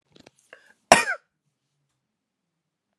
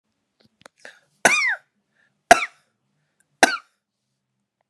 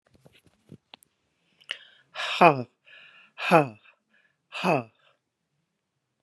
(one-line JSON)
{"cough_length": "3.0 s", "cough_amplitude": 32767, "cough_signal_mean_std_ratio": 0.16, "three_cough_length": "4.7 s", "three_cough_amplitude": 32768, "three_cough_signal_mean_std_ratio": 0.22, "exhalation_length": "6.2 s", "exhalation_amplitude": 29859, "exhalation_signal_mean_std_ratio": 0.23, "survey_phase": "beta (2021-08-13 to 2022-03-07)", "age": "45-64", "gender": "Female", "wearing_mask": "No", "symptom_none": true, "smoker_status": "Ex-smoker", "respiratory_condition_asthma": true, "respiratory_condition_other": false, "recruitment_source": "REACT", "submission_delay": "2 days", "covid_test_result": "Negative", "covid_test_method": "RT-qPCR"}